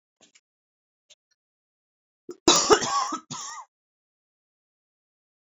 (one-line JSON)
{"cough_length": "5.5 s", "cough_amplitude": 23940, "cough_signal_mean_std_ratio": 0.26, "survey_phase": "beta (2021-08-13 to 2022-03-07)", "age": "45-64", "gender": "Female", "wearing_mask": "No", "symptom_cough_any": true, "symptom_shortness_of_breath": true, "symptom_abdominal_pain": true, "symptom_fatigue": true, "symptom_fever_high_temperature": true, "symptom_headache": true, "symptom_loss_of_taste": true, "symptom_onset": "4 days", "smoker_status": "Ex-smoker", "respiratory_condition_asthma": true, "respiratory_condition_other": false, "recruitment_source": "Test and Trace", "submission_delay": "2 days", "covid_test_result": "Positive", "covid_test_method": "ePCR"}